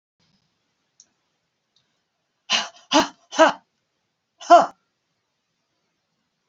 {"exhalation_length": "6.5 s", "exhalation_amplitude": 26766, "exhalation_signal_mean_std_ratio": 0.22, "survey_phase": "alpha (2021-03-01 to 2021-08-12)", "age": "65+", "gender": "Female", "wearing_mask": "No", "symptom_none": true, "smoker_status": "Never smoked", "respiratory_condition_asthma": false, "respiratory_condition_other": false, "recruitment_source": "REACT", "submission_delay": "4 days", "covid_test_result": "Negative", "covid_test_method": "RT-qPCR"}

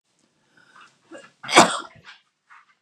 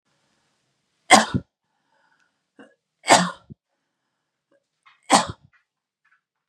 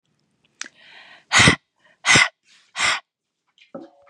{"cough_length": "2.8 s", "cough_amplitude": 32767, "cough_signal_mean_std_ratio": 0.22, "three_cough_length": "6.5 s", "three_cough_amplitude": 32767, "three_cough_signal_mean_std_ratio": 0.21, "exhalation_length": "4.1 s", "exhalation_amplitude": 31303, "exhalation_signal_mean_std_ratio": 0.32, "survey_phase": "beta (2021-08-13 to 2022-03-07)", "age": "18-44", "gender": "Female", "wearing_mask": "No", "symptom_none": true, "smoker_status": "Never smoked", "respiratory_condition_asthma": false, "respiratory_condition_other": false, "recruitment_source": "REACT", "submission_delay": "1 day", "covid_test_result": "Negative", "covid_test_method": "RT-qPCR", "influenza_a_test_result": "Negative", "influenza_b_test_result": "Negative"}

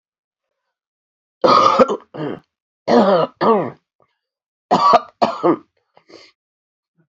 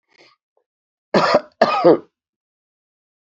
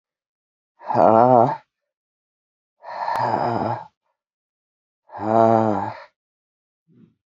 {"three_cough_length": "7.1 s", "three_cough_amplitude": 32767, "three_cough_signal_mean_std_ratio": 0.41, "cough_length": "3.2 s", "cough_amplitude": 32767, "cough_signal_mean_std_ratio": 0.33, "exhalation_length": "7.3 s", "exhalation_amplitude": 27798, "exhalation_signal_mean_std_ratio": 0.38, "survey_phase": "beta (2021-08-13 to 2022-03-07)", "age": "45-64", "gender": "Female", "wearing_mask": "No", "symptom_cough_any": true, "symptom_runny_or_blocked_nose": true, "symptom_shortness_of_breath": true, "symptom_sore_throat": true, "symptom_fatigue": true, "symptom_headache": true, "symptom_onset": "3 days", "smoker_status": "Ex-smoker", "respiratory_condition_asthma": true, "respiratory_condition_other": false, "recruitment_source": "Test and Trace", "submission_delay": "1 day", "covid_test_result": "Positive", "covid_test_method": "RT-qPCR", "covid_ct_value": 18.1, "covid_ct_gene": "N gene", "covid_ct_mean": 18.7, "covid_viral_load": "730000 copies/ml", "covid_viral_load_category": "Low viral load (10K-1M copies/ml)"}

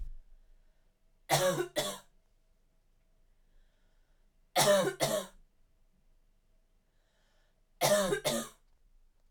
{"three_cough_length": "9.3 s", "three_cough_amplitude": 7228, "three_cough_signal_mean_std_ratio": 0.37, "survey_phase": "beta (2021-08-13 to 2022-03-07)", "age": "18-44", "gender": "Female", "wearing_mask": "No", "symptom_cough_any": true, "symptom_runny_or_blocked_nose": true, "symptom_shortness_of_breath": true, "symptom_fatigue": true, "symptom_headache": true, "symptom_onset": "4 days", "smoker_status": "Never smoked", "respiratory_condition_asthma": false, "respiratory_condition_other": false, "recruitment_source": "Test and Trace", "submission_delay": "2 days", "covid_test_result": "Positive", "covid_test_method": "RT-qPCR", "covid_ct_value": 19.6, "covid_ct_gene": "N gene", "covid_ct_mean": 20.2, "covid_viral_load": "240000 copies/ml", "covid_viral_load_category": "Low viral load (10K-1M copies/ml)"}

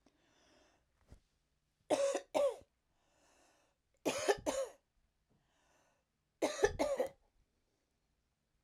{"three_cough_length": "8.6 s", "three_cough_amplitude": 5220, "three_cough_signal_mean_std_ratio": 0.33, "survey_phase": "alpha (2021-03-01 to 2021-08-12)", "age": "65+", "gender": "Female", "wearing_mask": "No", "symptom_none": true, "smoker_status": "Ex-smoker", "respiratory_condition_asthma": false, "respiratory_condition_other": false, "recruitment_source": "REACT", "submission_delay": "2 days", "covid_test_result": "Negative", "covid_test_method": "RT-qPCR"}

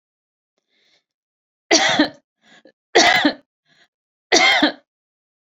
{"three_cough_length": "5.5 s", "three_cough_amplitude": 30340, "three_cough_signal_mean_std_ratio": 0.36, "survey_phase": "beta (2021-08-13 to 2022-03-07)", "age": "45-64", "gender": "Female", "wearing_mask": "No", "symptom_none": true, "smoker_status": "Never smoked", "respiratory_condition_asthma": false, "respiratory_condition_other": false, "recruitment_source": "REACT", "submission_delay": "1 day", "covid_test_result": "Negative", "covid_test_method": "RT-qPCR"}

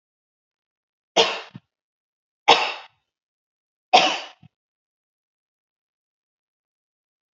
{"three_cough_length": "7.3 s", "three_cough_amplitude": 32205, "three_cough_signal_mean_std_ratio": 0.21, "survey_phase": "beta (2021-08-13 to 2022-03-07)", "age": "18-44", "gender": "Female", "wearing_mask": "No", "symptom_runny_or_blocked_nose": true, "symptom_sore_throat": true, "symptom_other": true, "smoker_status": "Never smoked", "respiratory_condition_asthma": false, "respiratory_condition_other": false, "recruitment_source": "Test and Trace", "submission_delay": "1 day", "covid_test_result": "Negative", "covid_test_method": "RT-qPCR"}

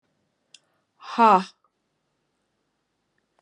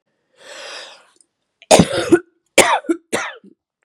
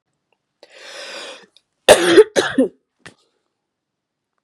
{"exhalation_length": "3.4 s", "exhalation_amplitude": 19981, "exhalation_signal_mean_std_ratio": 0.21, "three_cough_length": "3.8 s", "three_cough_amplitude": 32768, "three_cough_signal_mean_std_ratio": 0.35, "cough_length": "4.4 s", "cough_amplitude": 32768, "cough_signal_mean_std_ratio": 0.28, "survey_phase": "beta (2021-08-13 to 2022-03-07)", "age": "18-44", "gender": "Female", "wearing_mask": "No", "symptom_cough_any": true, "symptom_runny_or_blocked_nose": true, "symptom_fever_high_temperature": true, "symptom_change_to_sense_of_smell_or_taste": true, "symptom_onset": "5 days", "smoker_status": "Never smoked", "respiratory_condition_asthma": false, "respiratory_condition_other": false, "recruitment_source": "Test and Trace", "submission_delay": "1 day", "covid_test_result": "Positive", "covid_test_method": "RT-qPCR", "covid_ct_value": 20.5, "covid_ct_gene": "N gene"}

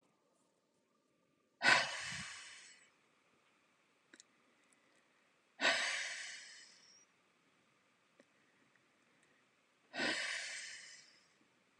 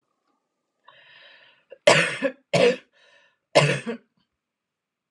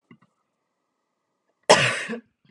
{"exhalation_length": "11.8 s", "exhalation_amplitude": 5497, "exhalation_signal_mean_std_ratio": 0.31, "three_cough_length": "5.1 s", "three_cough_amplitude": 28836, "three_cough_signal_mean_std_ratio": 0.32, "cough_length": "2.5 s", "cough_amplitude": 28782, "cough_signal_mean_std_ratio": 0.27, "survey_phase": "beta (2021-08-13 to 2022-03-07)", "age": "18-44", "gender": "Female", "wearing_mask": "No", "symptom_none": true, "smoker_status": "Ex-smoker", "respiratory_condition_asthma": false, "respiratory_condition_other": false, "recruitment_source": "REACT", "submission_delay": "2 days", "covid_test_result": "Negative", "covid_test_method": "RT-qPCR", "influenza_a_test_result": "Negative", "influenza_b_test_result": "Negative"}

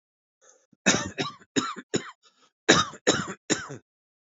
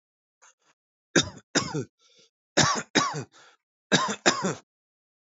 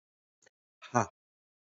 {"cough_length": "4.3 s", "cough_amplitude": 26085, "cough_signal_mean_std_ratio": 0.36, "three_cough_length": "5.2 s", "three_cough_amplitude": 19534, "three_cough_signal_mean_std_ratio": 0.37, "exhalation_length": "1.8 s", "exhalation_amplitude": 11175, "exhalation_signal_mean_std_ratio": 0.17, "survey_phase": "beta (2021-08-13 to 2022-03-07)", "age": "18-44", "gender": "Male", "wearing_mask": "No", "symptom_cough_any": true, "symptom_runny_or_blocked_nose": true, "symptom_sore_throat": true, "symptom_onset": "13 days", "smoker_status": "Current smoker (e-cigarettes or vapes only)", "respiratory_condition_asthma": false, "respiratory_condition_other": false, "recruitment_source": "REACT", "submission_delay": "2 days", "covid_test_result": "Positive", "covid_test_method": "RT-qPCR", "covid_ct_value": 30.0, "covid_ct_gene": "E gene", "influenza_a_test_result": "Negative", "influenza_b_test_result": "Negative"}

